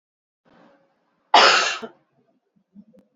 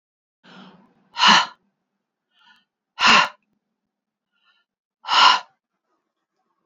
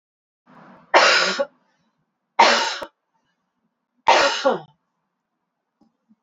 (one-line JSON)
{"cough_length": "3.2 s", "cough_amplitude": 28721, "cough_signal_mean_std_ratio": 0.28, "exhalation_length": "6.7 s", "exhalation_amplitude": 27850, "exhalation_signal_mean_std_ratio": 0.28, "three_cough_length": "6.2 s", "three_cough_amplitude": 29688, "three_cough_signal_mean_std_ratio": 0.36, "survey_phase": "beta (2021-08-13 to 2022-03-07)", "age": "45-64", "gender": "Female", "wearing_mask": "No", "symptom_cough_any": true, "symptom_runny_or_blocked_nose": true, "symptom_other": true, "smoker_status": "Never smoked", "respiratory_condition_asthma": false, "respiratory_condition_other": false, "recruitment_source": "Test and Trace", "submission_delay": "2 days", "covid_test_result": "Positive", "covid_test_method": "RT-qPCR", "covid_ct_value": 15.8, "covid_ct_gene": "ORF1ab gene", "covid_ct_mean": 16.5, "covid_viral_load": "3800000 copies/ml", "covid_viral_load_category": "High viral load (>1M copies/ml)"}